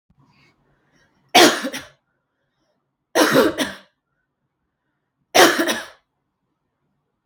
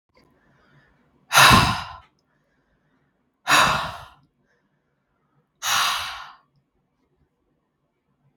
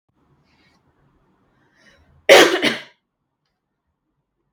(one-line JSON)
{"three_cough_length": "7.3 s", "three_cough_amplitude": 32768, "three_cough_signal_mean_std_ratio": 0.3, "exhalation_length": "8.4 s", "exhalation_amplitude": 32768, "exhalation_signal_mean_std_ratio": 0.3, "cough_length": "4.5 s", "cough_amplitude": 32768, "cough_signal_mean_std_ratio": 0.22, "survey_phase": "beta (2021-08-13 to 2022-03-07)", "age": "18-44", "gender": "Female", "wearing_mask": "No", "symptom_none": true, "symptom_onset": "5 days", "smoker_status": "Never smoked", "respiratory_condition_asthma": false, "respiratory_condition_other": false, "recruitment_source": "REACT", "submission_delay": "0 days", "covid_test_result": "Positive", "covid_test_method": "RT-qPCR", "covid_ct_value": 24.0, "covid_ct_gene": "E gene", "influenza_a_test_result": "Negative", "influenza_b_test_result": "Negative"}